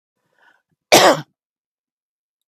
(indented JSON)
{
  "cough_length": "2.5 s",
  "cough_amplitude": 32768,
  "cough_signal_mean_std_ratio": 0.25,
  "survey_phase": "beta (2021-08-13 to 2022-03-07)",
  "age": "45-64",
  "gender": "Female",
  "wearing_mask": "No",
  "symptom_none": true,
  "smoker_status": "Never smoked",
  "respiratory_condition_asthma": false,
  "respiratory_condition_other": false,
  "recruitment_source": "REACT",
  "submission_delay": "1 day",
  "covid_test_result": "Negative",
  "covid_test_method": "RT-qPCR",
  "influenza_a_test_result": "Negative",
  "influenza_b_test_result": "Negative"
}